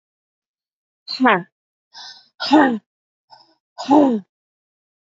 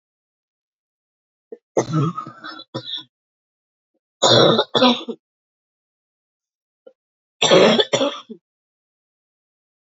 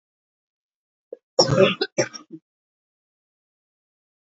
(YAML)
exhalation_length: 5.0 s
exhalation_amplitude: 29562
exhalation_signal_mean_std_ratio: 0.34
three_cough_length: 9.9 s
three_cough_amplitude: 32768
three_cough_signal_mean_std_ratio: 0.33
cough_length: 4.3 s
cough_amplitude: 26144
cough_signal_mean_std_ratio: 0.25
survey_phase: beta (2021-08-13 to 2022-03-07)
age: 45-64
gender: Female
wearing_mask: 'No'
symptom_cough_any: true
symptom_new_continuous_cough: true
symptom_runny_or_blocked_nose: true
symptom_shortness_of_breath: true
symptom_sore_throat: true
symptom_fatigue: true
symptom_fever_high_temperature: true
symptom_headache: true
smoker_status: Current smoker (e-cigarettes or vapes only)
respiratory_condition_asthma: false
respiratory_condition_other: false
recruitment_source: Test and Trace
submission_delay: 1 day
covid_test_result: Positive
covid_test_method: RT-qPCR
covid_ct_value: 29.5
covid_ct_gene: ORF1ab gene